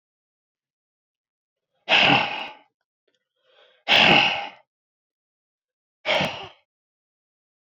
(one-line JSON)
{"exhalation_length": "7.8 s", "exhalation_amplitude": 24759, "exhalation_signal_mean_std_ratio": 0.32, "survey_phase": "beta (2021-08-13 to 2022-03-07)", "age": "45-64", "gender": "Male", "wearing_mask": "No", "symptom_cough_any": true, "symptom_runny_or_blocked_nose": true, "symptom_sore_throat": true, "symptom_fatigue": true, "symptom_headache": true, "symptom_other": true, "smoker_status": "Never smoked", "respiratory_condition_asthma": false, "respiratory_condition_other": false, "recruitment_source": "Test and Trace", "submission_delay": "1 day", "covid_test_result": "Positive", "covid_test_method": "RT-qPCR", "covid_ct_value": 21.1, "covid_ct_gene": "ORF1ab gene", "covid_ct_mean": 21.4, "covid_viral_load": "96000 copies/ml", "covid_viral_load_category": "Low viral load (10K-1M copies/ml)"}